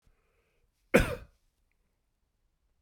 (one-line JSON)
{"cough_length": "2.8 s", "cough_amplitude": 12792, "cough_signal_mean_std_ratio": 0.19, "survey_phase": "beta (2021-08-13 to 2022-03-07)", "age": "45-64", "gender": "Male", "wearing_mask": "No", "symptom_none": true, "smoker_status": "Ex-smoker", "respiratory_condition_asthma": false, "respiratory_condition_other": false, "recruitment_source": "REACT", "submission_delay": "2 days", "covid_test_result": "Negative", "covid_test_method": "RT-qPCR"}